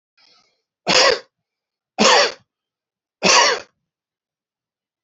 three_cough_length: 5.0 s
three_cough_amplitude: 32642
three_cough_signal_mean_std_ratio: 0.35
survey_phase: beta (2021-08-13 to 2022-03-07)
age: 45-64
gender: Male
wearing_mask: 'No'
symptom_runny_or_blocked_nose: true
symptom_sore_throat: true
smoker_status: Ex-smoker
respiratory_condition_asthma: false
respiratory_condition_other: false
recruitment_source: REACT
submission_delay: 1 day
covid_test_result: Negative
covid_test_method: RT-qPCR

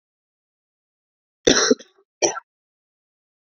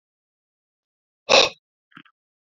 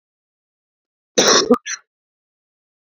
three_cough_length: 3.6 s
three_cough_amplitude: 27766
three_cough_signal_mean_std_ratio: 0.24
exhalation_length: 2.6 s
exhalation_amplitude: 27816
exhalation_signal_mean_std_ratio: 0.2
cough_length: 2.9 s
cough_amplitude: 31334
cough_signal_mean_std_ratio: 0.29
survey_phase: beta (2021-08-13 to 2022-03-07)
age: 18-44
gender: Male
wearing_mask: 'No'
symptom_cough_any: true
symptom_runny_or_blocked_nose: true
smoker_status: Never smoked
respiratory_condition_asthma: false
respiratory_condition_other: false
recruitment_source: REACT
submission_delay: 2 days
covid_test_result: Negative
covid_test_method: RT-qPCR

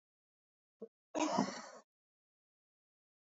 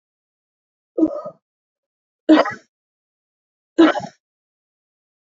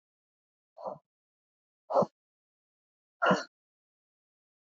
cough_length: 3.2 s
cough_amplitude: 4468
cough_signal_mean_std_ratio: 0.29
three_cough_length: 5.2 s
three_cough_amplitude: 27326
three_cough_signal_mean_std_ratio: 0.26
exhalation_length: 4.7 s
exhalation_amplitude: 7125
exhalation_signal_mean_std_ratio: 0.22
survey_phase: beta (2021-08-13 to 2022-03-07)
age: 45-64
gender: Female
wearing_mask: 'No'
symptom_cough_any: true
symptom_new_continuous_cough: true
symptom_runny_or_blocked_nose: true
symptom_fatigue: true
symptom_headache: true
symptom_change_to_sense_of_smell_or_taste: true
symptom_onset: 5 days
smoker_status: Ex-smoker
respiratory_condition_asthma: false
respiratory_condition_other: false
recruitment_source: Test and Trace
submission_delay: 2 days
covid_test_result: Positive
covid_test_method: RT-qPCR
covid_ct_value: 17.3
covid_ct_gene: ORF1ab gene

